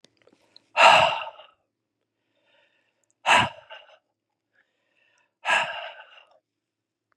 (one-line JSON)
{"exhalation_length": "7.2 s", "exhalation_amplitude": 28109, "exhalation_signal_mean_std_ratio": 0.28, "survey_phase": "beta (2021-08-13 to 2022-03-07)", "age": "45-64", "gender": "Male", "wearing_mask": "No", "symptom_none": true, "smoker_status": "Never smoked", "respiratory_condition_asthma": false, "respiratory_condition_other": false, "recruitment_source": "REACT", "submission_delay": "1 day", "covid_test_result": "Negative", "covid_test_method": "RT-qPCR", "influenza_a_test_result": "Negative", "influenza_b_test_result": "Negative"}